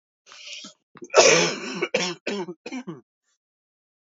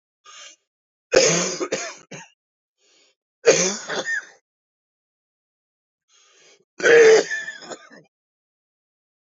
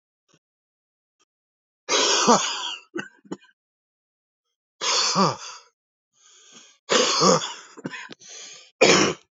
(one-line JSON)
{"cough_length": "4.0 s", "cough_amplitude": 27241, "cough_signal_mean_std_ratio": 0.38, "three_cough_length": "9.4 s", "three_cough_amplitude": 29368, "three_cough_signal_mean_std_ratio": 0.32, "exhalation_length": "9.3 s", "exhalation_amplitude": 26369, "exhalation_signal_mean_std_ratio": 0.4, "survey_phase": "beta (2021-08-13 to 2022-03-07)", "age": "45-64", "gender": "Male", "wearing_mask": "No", "symptom_cough_any": true, "symptom_new_continuous_cough": true, "symptom_runny_or_blocked_nose": true, "symptom_shortness_of_breath": true, "symptom_sore_throat": true, "symptom_diarrhoea": true, "symptom_fatigue": true, "symptom_onset": "5 days", "smoker_status": "Ex-smoker", "respiratory_condition_asthma": false, "respiratory_condition_other": false, "recruitment_source": "Test and Trace", "submission_delay": "2 days", "covid_test_result": "Positive", "covid_test_method": "RT-qPCR", "covid_ct_value": 15.0, "covid_ct_gene": "ORF1ab gene", "covid_ct_mean": 15.2, "covid_viral_load": "11000000 copies/ml", "covid_viral_load_category": "High viral load (>1M copies/ml)"}